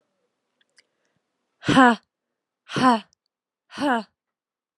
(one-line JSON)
{"exhalation_length": "4.8 s", "exhalation_amplitude": 29477, "exhalation_signal_mean_std_ratio": 0.28, "survey_phase": "alpha (2021-03-01 to 2021-08-12)", "age": "18-44", "gender": "Female", "wearing_mask": "No", "symptom_shortness_of_breath": true, "symptom_diarrhoea": true, "symptom_fatigue": true, "symptom_headache": true, "smoker_status": "Never smoked", "respiratory_condition_asthma": false, "respiratory_condition_other": false, "recruitment_source": "Test and Trace", "submission_delay": "1 day", "covid_test_result": "Positive", "covid_test_method": "ePCR"}